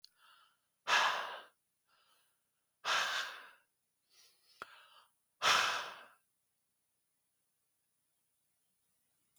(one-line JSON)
{"exhalation_length": "9.4 s", "exhalation_amplitude": 4586, "exhalation_signal_mean_std_ratio": 0.31, "survey_phase": "beta (2021-08-13 to 2022-03-07)", "age": "45-64", "gender": "Male", "wearing_mask": "No", "symptom_none": true, "smoker_status": "Ex-smoker", "respiratory_condition_asthma": false, "respiratory_condition_other": false, "recruitment_source": "REACT", "submission_delay": "8 days", "covid_test_result": "Negative", "covid_test_method": "RT-qPCR", "influenza_a_test_result": "Negative", "influenza_b_test_result": "Negative"}